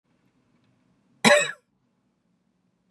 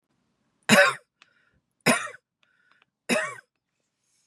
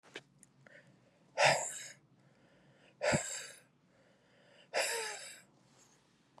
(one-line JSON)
{"cough_length": "2.9 s", "cough_amplitude": 27056, "cough_signal_mean_std_ratio": 0.22, "three_cough_length": "4.3 s", "three_cough_amplitude": 24081, "three_cough_signal_mean_std_ratio": 0.28, "exhalation_length": "6.4 s", "exhalation_amplitude": 7040, "exhalation_signal_mean_std_ratio": 0.35, "survey_phase": "beta (2021-08-13 to 2022-03-07)", "age": "45-64", "gender": "Female", "wearing_mask": "No", "symptom_none": true, "smoker_status": "Never smoked", "respiratory_condition_asthma": false, "respiratory_condition_other": false, "recruitment_source": "REACT", "submission_delay": "1 day", "covid_test_result": "Negative", "covid_test_method": "RT-qPCR", "influenza_a_test_result": "Negative", "influenza_b_test_result": "Negative"}